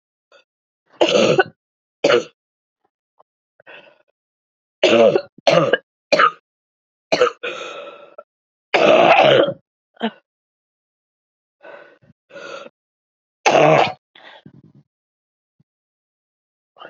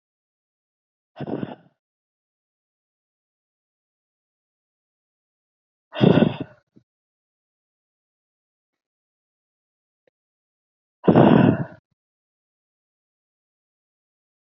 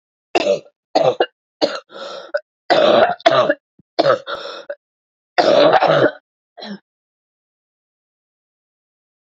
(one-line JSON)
{"three_cough_length": "16.9 s", "three_cough_amplitude": 32166, "three_cough_signal_mean_std_ratio": 0.35, "exhalation_length": "14.5 s", "exhalation_amplitude": 25883, "exhalation_signal_mean_std_ratio": 0.19, "cough_length": "9.3 s", "cough_amplitude": 29512, "cough_signal_mean_std_ratio": 0.42, "survey_phase": "beta (2021-08-13 to 2022-03-07)", "age": "45-64", "gender": "Female", "wearing_mask": "No", "symptom_cough_any": true, "symptom_runny_or_blocked_nose": true, "symptom_shortness_of_breath": true, "symptom_diarrhoea": true, "symptom_fatigue": true, "symptom_fever_high_temperature": true, "symptom_headache": true, "symptom_change_to_sense_of_smell_or_taste": true, "symptom_onset": "2 days", "smoker_status": "Ex-smoker", "respiratory_condition_asthma": false, "respiratory_condition_other": false, "recruitment_source": "Test and Trace", "submission_delay": "1 day", "covid_test_result": "Positive", "covid_test_method": "RT-qPCR", "covid_ct_value": 20.0, "covid_ct_gene": "ORF1ab gene", "covid_ct_mean": 20.3, "covid_viral_load": "220000 copies/ml", "covid_viral_load_category": "Low viral load (10K-1M copies/ml)"}